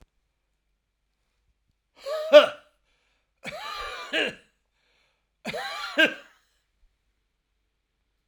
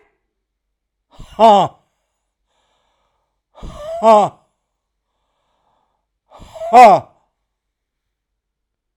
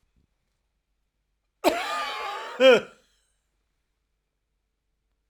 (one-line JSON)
{"three_cough_length": "8.3 s", "three_cough_amplitude": 28473, "three_cough_signal_mean_std_ratio": 0.23, "exhalation_length": "9.0 s", "exhalation_amplitude": 32768, "exhalation_signal_mean_std_ratio": 0.26, "cough_length": "5.3 s", "cough_amplitude": 17773, "cough_signal_mean_std_ratio": 0.27, "survey_phase": "alpha (2021-03-01 to 2021-08-12)", "age": "65+", "gender": "Male", "wearing_mask": "No", "symptom_none": true, "smoker_status": "Ex-smoker", "respiratory_condition_asthma": false, "respiratory_condition_other": false, "recruitment_source": "REACT", "submission_delay": "1 day", "covid_test_result": "Negative", "covid_test_method": "RT-qPCR"}